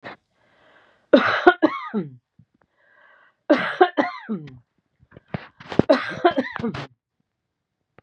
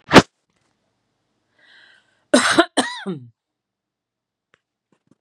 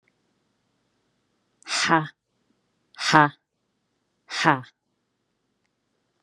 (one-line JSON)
{"three_cough_length": "8.0 s", "three_cough_amplitude": 32768, "three_cough_signal_mean_std_ratio": 0.34, "cough_length": "5.2 s", "cough_amplitude": 32768, "cough_signal_mean_std_ratio": 0.23, "exhalation_length": "6.2 s", "exhalation_amplitude": 32767, "exhalation_signal_mean_std_ratio": 0.24, "survey_phase": "beta (2021-08-13 to 2022-03-07)", "age": "45-64", "gender": "Female", "wearing_mask": "No", "symptom_fatigue": true, "symptom_headache": true, "symptom_onset": "12 days", "smoker_status": "Never smoked", "respiratory_condition_asthma": false, "respiratory_condition_other": false, "recruitment_source": "REACT", "submission_delay": "0 days", "covid_test_result": "Negative", "covid_test_method": "RT-qPCR"}